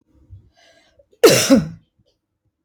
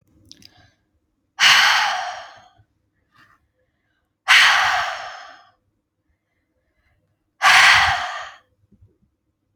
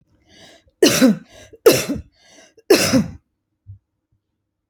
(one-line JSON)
{"cough_length": "2.6 s", "cough_amplitude": 29124, "cough_signal_mean_std_ratio": 0.31, "exhalation_length": "9.6 s", "exhalation_amplitude": 32768, "exhalation_signal_mean_std_ratio": 0.37, "three_cough_length": "4.7 s", "three_cough_amplitude": 29632, "three_cough_signal_mean_std_ratio": 0.35, "survey_phase": "beta (2021-08-13 to 2022-03-07)", "age": "18-44", "gender": "Female", "wearing_mask": "No", "symptom_none": true, "smoker_status": "Ex-smoker", "respiratory_condition_asthma": false, "respiratory_condition_other": false, "recruitment_source": "REACT", "submission_delay": "1 day", "covid_test_result": "Negative", "covid_test_method": "RT-qPCR"}